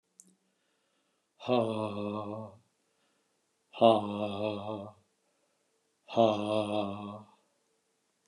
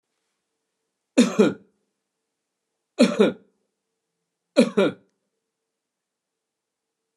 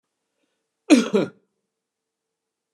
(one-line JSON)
{"exhalation_length": "8.3 s", "exhalation_amplitude": 12813, "exhalation_signal_mean_std_ratio": 0.38, "three_cough_length": "7.2 s", "three_cough_amplitude": 26602, "three_cough_signal_mean_std_ratio": 0.25, "cough_length": "2.7 s", "cough_amplitude": 26570, "cough_signal_mean_std_ratio": 0.24, "survey_phase": "beta (2021-08-13 to 2022-03-07)", "age": "65+", "gender": "Male", "wearing_mask": "No", "symptom_none": true, "smoker_status": "Never smoked", "respiratory_condition_asthma": false, "respiratory_condition_other": false, "recruitment_source": "REACT", "submission_delay": "1 day", "covid_test_result": "Negative", "covid_test_method": "RT-qPCR"}